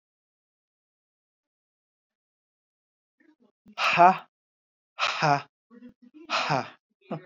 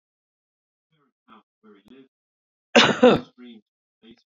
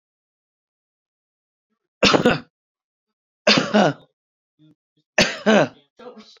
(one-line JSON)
{"exhalation_length": "7.3 s", "exhalation_amplitude": 19281, "exhalation_signal_mean_std_ratio": 0.27, "cough_length": "4.3 s", "cough_amplitude": 26221, "cough_signal_mean_std_ratio": 0.23, "three_cough_length": "6.4 s", "three_cough_amplitude": 27439, "three_cough_signal_mean_std_ratio": 0.32, "survey_phase": "beta (2021-08-13 to 2022-03-07)", "age": "45-64", "gender": "Male", "wearing_mask": "No", "symptom_none": true, "smoker_status": "Ex-smoker", "respiratory_condition_asthma": false, "respiratory_condition_other": false, "recruitment_source": "REACT", "submission_delay": "1 day", "covid_test_result": "Negative", "covid_test_method": "RT-qPCR", "influenza_a_test_result": "Negative", "influenza_b_test_result": "Negative"}